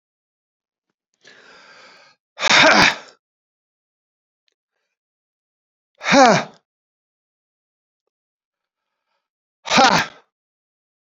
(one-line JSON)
{"exhalation_length": "11.0 s", "exhalation_amplitude": 32768, "exhalation_signal_mean_std_ratio": 0.27, "survey_phase": "beta (2021-08-13 to 2022-03-07)", "age": "45-64", "gender": "Male", "wearing_mask": "Yes", "symptom_none": true, "smoker_status": "Ex-smoker", "respiratory_condition_asthma": false, "respiratory_condition_other": false, "recruitment_source": "REACT", "submission_delay": "2 days", "covid_test_result": "Negative", "covid_test_method": "RT-qPCR", "influenza_a_test_result": "Negative", "influenza_b_test_result": "Negative"}